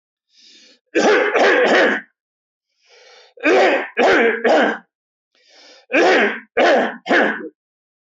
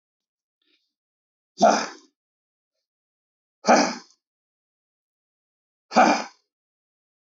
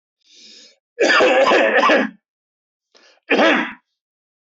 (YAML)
three_cough_length: 8.0 s
three_cough_amplitude: 23462
three_cough_signal_mean_std_ratio: 0.59
exhalation_length: 7.3 s
exhalation_amplitude: 21862
exhalation_signal_mean_std_ratio: 0.24
cough_length: 4.5 s
cough_amplitude: 21981
cough_signal_mean_std_ratio: 0.51
survey_phase: alpha (2021-03-01 to 2021-08-12)
age: 45-64
gender: Male
wearing_mask: 'No'
symptom_none: true
smoker_status: Never smoked
respiratory_condition_asthma: false
respiratory_condition_other: false
recruitment_source: REACT
submission_delay: 1 day
covid_test_result: Negative
covid_test_method: RT-qPCR